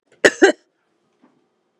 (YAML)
cough_length: 1.8 s
cough_amplitude: 32768
cough_signal_mean_std_ratio: 0.24
survey_phase: beta (2021-08-13 to 2022-03-07)
age: 45-64
gender: Female
wearing_mask: 'No'
symptom_none: true
smoker_status: Never smoked
respiratory_condition_asthma: false
respiratory_condition_other: false
recruitment_source: REACT
submission_delay: 1 day
covid_test_result: Negative
covid_test_method: RT-qPCR
influenza_a_test_result: Negative
influenza_b_test_result: Negative